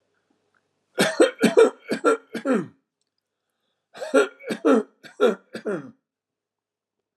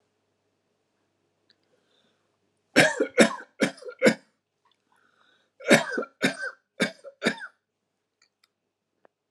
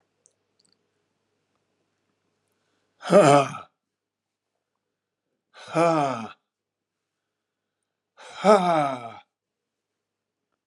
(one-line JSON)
{"cough_length": "7.2 s", "cough_amplitude": 22199, "cough_signal_mean_std_ratio": 0.37, "three_cough_length": "9.3 s", "three_cough_amplitude": 27160, "three_cough_signal_mean_std_ratio": 0.27, "exhalation_length": "10.7 s", "exhalation_amplitude": 25104, "exhalation_signal_mean_std_ratio": 0.27, "survey_phase": "alpha (2021-03-01 to 2021-08-12)", "age": "65+", "gender": "Male", "wearing_mask": "No", "symptom_none": true, "smoker_status": "Ex-smoker", "respiratory_condition_asthma": false, "respiratory_condition_other": false, "recruitment_source": "REACT", "submission_delay": "3 days", "covid_test_result": "Negative", "covid_test_method": "RT-qPCR"}